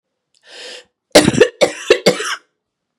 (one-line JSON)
{"three_cough_length": "3.0 s", "three_cough_amplitude": 32768, "three_cough_signal_mean_std_ratio": 0.36, "survey_phase": "beta (2021-08-13 to 2022-03-07)", "age": "45-64", "gender": "Female", "wearing_mask": "No", "symptom_runny_or_blocked_nose": true, "symptom_sore_throat": true, "symptom_fatigue": true, "symptom_headache": true, "smoker_status": "Ex-smoker", "respiratory_condition_asthma": true, "respiratory_condition_other": false, "recruitment_source": "Test and Trace", "submission_delay": "1 day", "covid_test_result": "Positive", "covid_test_method": "ePCR"}